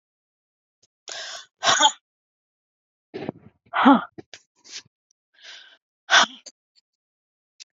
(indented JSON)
{
  "exhalation_length": "7.8 s",
  "exhalation_amplitude": 26296,
  "exhalation_signal_mean_std_ratio": 0.26,
  "survey_phase": "beta (2021-08-13 to 2022-03-07)",
  "age": "45-64",
  "gender": "Female",
  "wearing_mask": "No",
  "symptom_cough_any": true,
  "symptom_runny_or_blocked_nose": true,
  "symptom_shortness_of_breath": true,
  "symptom_sore_throat": true,
  "symptom_abdominal_pain": true,
  "symptom_diarrhoea": true,
  "symptom_fever_high_temperature": true,
  "symptom_onset": "3 days",
  "smoker_status": "Never smoked",
  "respiratory_condition_asthma": false,
  "respiratory_condition_other": false,
  "recruitment_source": "Test and Trace",
  "submission_delay": "1 day",
  "covid_test_result": "Positive",
  "covid_test_method": "RT-qPCR",
  "covid_ct_value": 15.0,
  "covid_ct_gene": "ORF1ab gene",
  "covid_ct_mean": 15.4,
  "covid_viral_load": "8900000 copies/ml",
  "covid_viral_load_category": "High viral load (>1M copies/ml)"
}